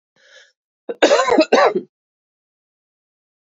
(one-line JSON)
{"cough_length": "3.6 s", "cough_amplitude": 29026, "cough_signal_mean_std_ratio": 0.35, "survey_phase": "beta (2021-08-13 to 2022-03-07)", "age": "45-64", "gender": "Female", "wearing_mask": "No", "symptom_runny_or_blocked_nose": true, "symptom_fatigue": true, "symptom_headache": true, "symptom_onset": "4 days", "smoker_status": "Ex-smoker", "respiratory_condition_asthma": true, "respiratory_condition_other": false, "recruitment_source": "Test and Trace", "submission_delay": "1 day", "covid_test_result": "Positive", "covid_test_method": "RT-qPCR", "covid_ct_value": 18.9, "covid_ct_gene": "ORF1ab gene", "covid_ct_mean": 19.2, "covid_viral_load": "500000 copies/ml", "covid_viral_load_category": "Low viral load (10K-1M copies/ml)"}